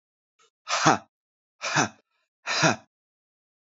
{"exhalation_length": "3.8 s", "exhalation_amplitude": 25397, "exhalation_signal_mean_std_ratio": 0.33, "survey_phase": "beta (2021-08-13 to 2022-03-07)", "age": "18-44", "gender": "Male", "wearing_mask": "No", "symptom_cough_any": true, "symptom_runny_or_blocked_nose": true, "symptom_sore_throat": true, "symptom_fatigue": true, "symptom_headache": true, "symptom_onset": "9 days", "smoker_status": "Never smoked", "respiratory_condition_asthma": false, "respiratory_condition_other": false, "recruitment_source": "Test and Trace", "submission_delay": "1 day", "covid_test_result": "Positive", "covid_test_method": "RT-qPCR", "covid_ct_value": 24.3, "covid_ct_gene": "ORF1ab gene", "covid_ct_mean": 24.7, "covid_viral_load": "7900 copies/ml", "covid_viral_load_category": "Minimal viral load (< 10K copies/ml)"}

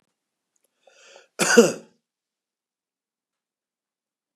{"cough_length": "4.4 s", "cough_amplitude": 31522, "cough_signal_mean_std_ratio": 0.19, "survey_phase": "beta (2021-08-13 to 2022-03-07)", "age": "65+", "gender": "Male", "wearing_mask": "No", "symptom_none": true, "smoker_status": "Ex-smoker", "respiratory_condition_asthma": false, "respiratory_condition_other": false, "recruitment_source": "REACT", "submission_delay": "1 day", "covid_test_result": "Negative", "covid_test_method": "RT-qPCR", "influenza_a_test_result": "Negative", "influenza_b_test_result": "Negative"}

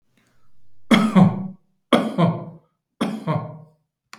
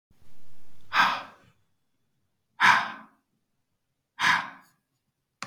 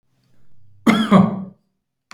{"three_cough_length": "4.2 s", "three_cough_amplitude": 32674, "three_cough_signal_mean_std_ratio": 0.45, "exhalation_length": "5.5 s", "exhalation_amplitude": 17548, "exhalation_signal_mean_std_ratio": 0.4, "cough_length": "2.1 s", "cough_amplitude": 32120, "cough_signal_mean_std_ratio": 0.4, "survey_phase": "beta (2021-08-13 to 2022-03-07)", "age": "45-64", "gender": "Male", "wearing_mask": "No", "symptom_none": true, "smoker_status": "Ex-smoker", "respiratory_condition_asthma": false, "respiratory_condition_other": false, "recruitment_source": "REACT", "submission_delay": "1 day", "covid_test_result": "Negative", "covid_test_method": "RT-qPCR", "influenza_a_test_result": "Negative", "influenza_b_test_result": "Negative"}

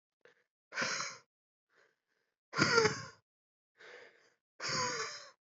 {"exhalation_length": "5.5 s", "exhalation_amplitude": 6925, "exhalation_signal_mean_std_ratio": 0.37, "survey_phase": "beta (2021-08-13 to 2022-03-07)", "age": "18-44", "gender": "Male", "wearing_mask": "No", "symptom_cough_any": true, "symptom_runny_or_blocked_nose": true, "symptom_shortness_of_breath": true, "symptom_sore_throat": true, "symptom_abdominal_pain": true, "symptom_fatigue": true, "symptom_fever_high_temperature": true, "symptom_headache": true, "symptom_change_to_sense_of_smell_or_taste": true, "symptom_loss_of_taste": true, "symptom_onset": "5 days", "smoker_status": "Never smoked", "respiratory_condition_asthma": false, "respiratory_condition_other": false, "recruitment_source": "Test and Trace", "submission_delay": "1 day", "covid_test_result": "Positive", "covid_test_method": "RT-qPCR", "covid_ct_value": 18.5, "covid_ct_gene": "ORF1ab gene", "covid_ct_mean": 19.6, "covid_viral_load": "380000 copies/ml", "covid_viral_load_category": "Low viral load (10K-1M copies/ml)"}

